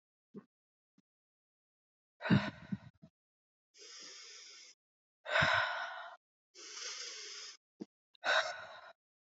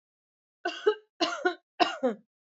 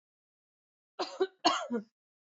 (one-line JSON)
{"exhalation_length": "9.4 s", "exhalation_amplitude": 4446, "exhalation_signal_mean_std_ratio": 0.35, "three_cough_length": "2.5 s", "three_cough_amplitude": 16154, "three_cough_signal_mean_std_ratio": 0.41, "cough_length": "2.4 s", "cough_amplitude": 8259, "cough_signal_mean_std_ratio": 0.34, "survey_phase": "beta (2021-08-13 to 2022-03-07)", "age": "18-44", "gender": "Female", "wearing_mask": "No", "symptom_cough_any": true, "symptom_runny_or_blocked_nose": true, "symptom_sore_throat": true, "symptom_onset": "3 days", "smoker_status": "Never smoked", "respiratory_condition_asthma": false, "respiratory_condition_other": false, "recruitment_source": "Test and Trace", "submission_delay": "1 day", "covid_test_result": "Positive", "covid_test_method": "RT-qPCR", "covid_ct_value": 23.2, "covid_ct_gene": "ORF1ab gene"}